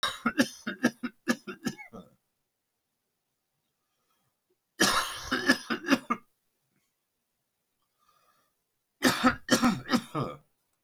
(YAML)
three_cough_length: 10.8 s
three_cough_amplitude: 15079
three_cough_signal_mean_std_ratio: 0.35
survey_phase: beta (2021-08-13 to 2022-03-07)
age: 65+
gender: Male
wearing_mask: 'No'
symptom_none: true
smoker_status: Current smoker (1 to 10 cigarettes per day)
respiratory_condition_asthma: false
respiratory_condition_other: false
recruitment_source: REACT
submission_delay: 1 day
covid_test_result: Negative
covid_test_method: RT-qPCR